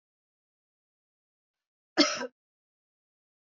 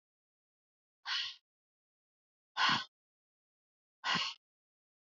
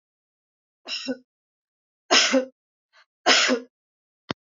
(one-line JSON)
{"cough_length": "3.5 s", "cough_amplitude": 13725, "cough_signal_mean_std_ratio": 0.18, "exhalation_length": "5.1 s", "exhalation_amplitude": 4096, "exhalation_signal_mean_std_ratio": 0.3, "three_cough_length": "4.5 s", "three_cough_amplitude": 24864, "three_cough_signal_mean_std_ratio": 0.33, "survey_phase": "beta (2021-08-13 to 2022-03-07)", "age": "45-64", "gender": "Female", "wearing_mask": "No", "symptom_none": true, "smoker_status": "Never smoked", "respiratory_condition_asthma": false, "respiratory_condition_other": false, "recruitment_source": "REACT", "submission_delay": "1 day", "covid_test_result": "Negative", "covid_test_method": "RT-qPCR", "influenza_a_test_result": "Negative", "influenza_b_test_result": "Negative"}